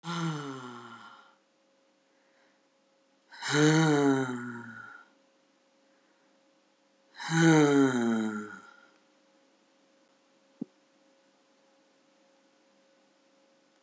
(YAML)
exhalation_length: 13.8 s
exhalation_amplitude: 11157
exhalation_signal_mean_std_ratio: 0.36
survey_phase: beta (2021-08-13 to 2022-03-07)
age: 45-64
gender: Female
wearing_mask: 'No'
symptom_cough_any: true
symptom_runny_or_blocked_nose: true
symptom_onset: 6 days
smoker_status: Never smoked
respiratory_condition_asthma: false
respiratory_condition_other: false
recruitment_source: Test and Trace
submission_delay: 2 days
covid_test_result: Positive
covid_test_method: ePCR